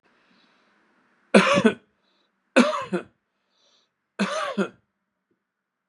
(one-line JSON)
{"three_cough_length": "5.9 s", "three_cough_amplitude": 29790, "three_cough_signal_mean_std_ratio": 0.31, "survey_phase": "beta (2021-08-13 to 2022-03-07)", "age": "45-64", "gender": "Male", "wearing_mask": "No", "symptom_runny_or_blocked_nose": true, "smoker_status": "Never smoked", "respiratory_condition_asthma": false, "respiratory_condition_other": false, "recruitment_source": "REACT", "submission_delay": "4 days", "covid_test_result": "Negative", "covid_test_method": "RT-qPCR", "influenza_a_test_result": "Negative", "influenza_b_test_result": "Negative"}